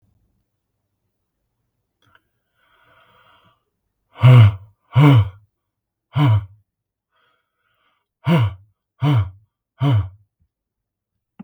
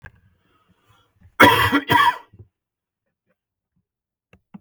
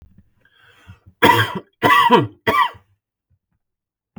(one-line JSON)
{"exhalation_length": "11.4 s", "exhalation_amplitude": 31486, "exhalation_signal_mean_std_ratio": 0.31, "cough_length": "4.6 s", "cough_amplitude": 32768, "cough_signal_mean_std_ratio": 0.29, "three_cough_length": "4.2 s", "three_cough_amplitude": 32768, "three_cough_signal_mean_std_ratio": 0.39, "survey_phase": "beta (2021-08-13 to 2022-03-07)", "age": "18-44", "gender": "Male", "wearing_mask": "No", "symptom_cough_any": true, "symptom_onset": "12 days", "smoker_status": "Never smoked", "respiratory_condition_asthma": false, "respiratory_condition_other": false, "recruitment_source": "REACT", "submission_delay": "4 days", "covid_test_result": "Positive", "covid_test_method": "RT-qPCR", "covid_ct_value": 36.0, "covid_ct_gene": "E gene", "influenza_a_test_result": "Negative", "influenza_b_test_result": "Negative"}